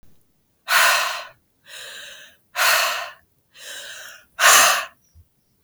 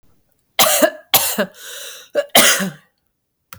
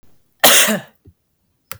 {"exhalation_length": "5.6 s", "exhalation_amplitude": 32331, "exhalation_signal_mean_std_ratio": 0.43, "three_cough_length": "3.6 s", "three_cough_amplitude": 32768, "three_cough_signal_mean_std_ratio": 0.44, "cough_length": "1.8 s", "cough_amplitude": 32768, "cough_signal_mean_std_ratio": 0.37, "survey_phase": "beta (2021-08-13 to 2022-03-07)", "age": "45-64", "gender": "Female", "wearing_mask": "No", "symptom_none": true, "smoker_status": "Ex-smoker", "respiratory_condition_asthma": true, "respiratory_condition_other": false, "recruitment_source": "REACT", "submission_delay": "7 days", "covid_test_result": "Negative", "covid_test_method": "RT-qPCR", "influenza_a_test_result": "Negative", "influenza_b_test_result": "Negative"}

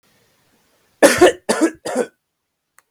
{"cough_length": "2.9 s", "cough_amplitude": 32746, "cough_signal_mean_std_ratio": 0.34, "survey_phase": "beta (2021-08-13 to 2022-03-07)", "age": "18-44", "gender": "Male", "wearing_mask": "No", "symptom_none": true, "symptom_onset": "12 days", "smoker_status": "Never smoked", "respiratory_condition_asthma": false, "respiratory_condition_other": false, "recruitment_source": "REACT", "submission_delay": "2 days", "covid_test_result": "Negative", "covid_test_method": "RT-qPCR", "influenza_a_test_result": "Negative", "influenza_b_test_result": "Negative"}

